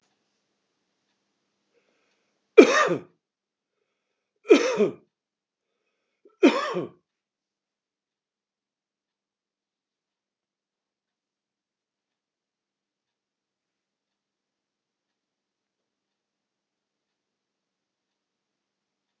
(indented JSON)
{
  "three_cough_length": "19.2 s",
  "three_cough_amplitude": 32768,
  "three_cough_signal_mean_std_ratio": 0.15,
  "survey_phase": "beta (2021-08-13 to 2022-03-07)",
  "age": "65+",
  "gender": "Male",
  "wearing_mask": "No",
  "symptom_none": true,
  "smoker_status": "Ex-smoker",
  "respiratory_condition_asthma": false,
  "respiratory_condition_other": false,
  "recruitment_source": "REACT",
  "submission_delay": "1 day",
  "covid_test_result": "Negative",
  "covid_test_method": "RT-qPCR",
  "influenza_a_test_result": "Negative",
  "influenza_b_test_result": "Negative"
}